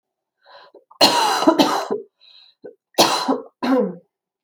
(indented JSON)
{
  "cough_length": "4.4 s",
  "cough_amplitude": 29997,
  "cough_signal_mean_std_ratio": 0.49,
  "survey_phase": "alpha (2021-03-01 to 2021-08-12)",
  "age": "45-64",
  "gender": "Female",
  "wearing_mask": "No",
  "symptom_cough_any": true,
  "symptom_shortness_of_breath": true,
  "smoker_status": "Ex-smoker",
  "respiratory_condition_asthma": true,
  "respiratory_condition_other": false,
  "recruitment_source": "REACT",
  "submission_delay": "8 days",
  "covid_test_result": "Negative",
  "covid_test_method": "RT-qPCR"
}